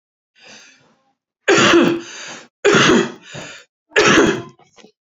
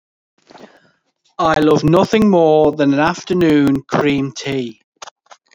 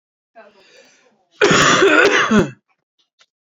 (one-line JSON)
{"three_cough_length": "5.1 s", "three_cough_amplitude": 32658, "three_cough_signal_mean_std_ratio": 0.48, "exhalation_length": "5.5 s", "exhalation_amplitude": 27621, "exhalation_signal_mean_std_ratio": 0.65, "cough_length": "3.6 s", "cough_amplitude": 32767, "cough_signal_mean_std_ratio": 0.48, "survey_phase": "beta (2021-08-13 to 2022-03-07)", "age": "45-64", "gender": "Male", "wearing_mask": "No", "symptom_none": true, "smoker_status": "Never smoked", "respiratory_condition_asthma": false, "respiratory_condition_other": false, "recruitment_source": "REACT", "submission_delay": "1 day", "covid_test_result": "Negative", "covid_test_method": "RT-qPCR"}